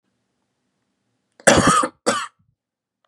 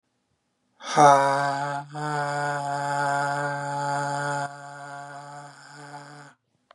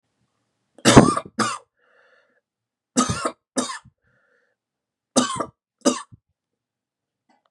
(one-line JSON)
{"cough_length": "3.1 s", "cough_amplitude": 32767, "cough_signal_mean_std_ratio": 0.33, "exhalation_length": "6.7 s", "exhalation_amplitude": 25153, "exhalation_signal_mean_std_ratio": 0.58, "three_cough_length": "7.5 s", "three_cough_amplitude": 32768, "three_cough_signal_mean_std_ratio": 0.26, "survey_phase": "beta (2021-08-13 to 2022-03-07)", "age": "18-44", "gender": "Male", "wearing_mask": "No", "symptom_cough_any": true, "symptom_sore_throat": true, "symptom_headache": true, "symptom_onset": "2 days", "smoker_status": "Never smoked", "respiratory_condition_asthma": false, "respiratory_condition_other": false, "recruitment_source": "Test and Trace", "submission_delay": "1 day", "covid_test_result": "Positive", "covid_test_method": "RT-qPCR", "covid_ct_value": 22.4, "covid_ct_gene": "ORF1ab gene"}